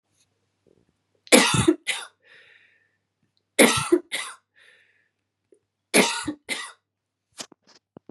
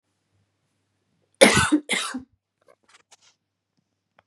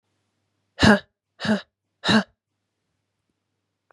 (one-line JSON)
{"three_cough_length": "8.1 s", "three_cough_amplitude": 30909, "three_cough_signal_mean_std_ratio": 0.3, "cough_length": "4.3 s", "cough_amplitude": 32599, "cough_signal_mean_std_ratio": 0.26, "exhalation_length": "3.9 s", "exhalation_amplitude": 28880, "exhalation_signal_mean_std_ratio": 0.27, "survey_phase": "beta (2021-08-13 to 2022-03-07)", "age": "18-44", "gender": "Female", "wearing_mask": "No", "symptom_runny_or_blocked_nose": true, "symptom_headache": true, "smoker_status": "Never smoked", "respiratory_condition_asthma": false, "respiratory_condition_other": false, "recruitment_source": "Test and Trace", "submission_delay": "2 days", "covid_test_result": "Positive", "covid_test_method": "RT-qPCR"}